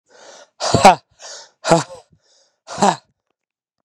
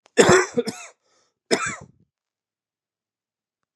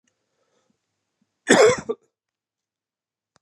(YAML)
exhalation_length: 3.8 s
exhalation_amplitude: 32768
exhalation_signal_mean_std_ratio: 0.29
three_cough_length: 3.8 s
three_cough_amplitude: 29220
three_cough_signal_mean_std_ratio: 0.29
cough_length: 3.4 s
cough_amplitude: 29980
cough_signal_mean_std_ratio: 0.24
survey_phase: beta (2021-08-13 to 2022-03-07)
age: 18-44
gender: Male
wearing_mask: 'No'
symptom_cough_any: true
symptom_shortness_of_breath: true
symptom_fatigue: true
symptom_fever_high_temperature: true
smoker_status: Never smoked
respiratory_condition_asthma: true
respiratory_condition_other: false
recruitment_source: Test and Trace
submission_delay: 2 days
covid_test_result: Positive
covid_test_method: RT-qPCR
covid_ct_value: 17.9
covid_ct_gene: ORF1ab gene